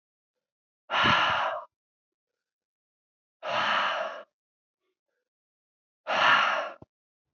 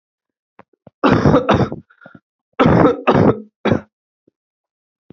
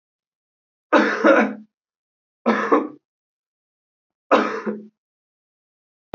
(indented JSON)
{
  "exhalation_length": "7.3 s",
  "exhalation_amplitude": 12652,
  "exhalation_signal_mean_std_ratio": 0.42,
  "cough_length": "5.1 s",
  "cough_amplitude": 31423,
  "cough_signal_mean_std_ratio": 0.44,
  "three_cough_length": "6.1 s",
  "three_cough_amplitude": 27790,
  "three_cough_signal_mean_std_ratio": 0.35,
  "survey_phase": "beta (2021-08-13 to 2022-03-07)",
  "age": "18-44",
  "gender": "Male",
  "wearing_mask": "No",
  "symptom_cough_any": true,
  "symptom_runny_or_blocked_nose": true,
  "symptom_sore_throat": true,
  "symptom_fatigue": true,
  "symptom_fever_high_temperature": true,
  "symptom_headache": true,
  "symptom_other": true,
  "smoker_status": "Never smoked",
  "respiratory_condition_asthma": false,
  "respiratory_condition_other": false,
  "recruitment_source": "Test and Trace",
  "submission_delay": "1 day",
  "covid_test_result": "Positive",
  "covid_test_method": "RT-qPCR",
  "covid_ct_value": 16.1,
  "covid_ct_gene": "ORF1ab gene"
}